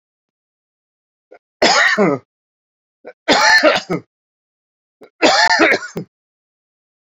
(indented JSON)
{
  "three_cough_length": "7.2 s",
  "three_cough_amplitude": 31263,
  "three_cough_signal_mean_std_ratio": 0.41,
  "survey_phase": "beta (2021-08-13 to 2022-03-07)",
  "age": "65+",
  "gender": "Male",
  "wearing_mask": "No",
  "symptom_cough_any": true,
  "symptom_runny_or_blocked_nose": true,
  "symptom_sore_throat": true,
  "symptom_fatigue": true,
  "symptom_fever_high_temperature": true,
  "symptom_headache": true,
  "symptom_change_to_sense_of_smell_or_taste": true,
  "symptom_onset": "2 days",
  "smoker_status": "Ex-smoker",
  "respiratory_condition_asthma": false,
  "respiratory_condition_other": false,
  "recruitment_source": "Test and Trace",
  "submission_delay": "1 day",
  "covid_test_result": "Positive",
  "covid_test_method": "RT-qPCR"
}